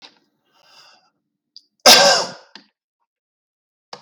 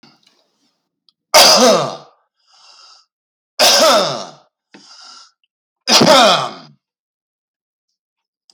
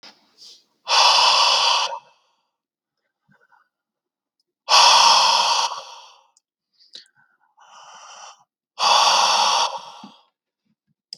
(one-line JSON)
{"cough_length": "4.0 s", "cough_amplitude": 32474, "cough_signal_mean_std_ratio": 0.25, "three_cough_length": "8.5 s", "three_cough_amplitude": 32474, "three_cough_signal_mean_std_ratio": 0.39, "exhalation_length": "11.2 s", "exhalation_amplitude": 31216, "exhalation_signal_mean_std_ratio": 0.45, "survey_phase": "beta (2021-08-13 to 2022-03-07)", "age": "18-44", "gender": "Male", "wearing_mask": "No", "symptom_cough_any": true, "smoker_status": "Current smoker (11 or more cigarettes per day)", "respiratory_condition_asthma": false, "respiratory_condition_other": false, "recruitment_source": "REACT", "submission_delay": "6 days", "covid_test_result": "Negative", "covid_test_method": "RT-qPCR", "influenza_a_test_result": "Negative", "influenza_b_test_result": "Negative"}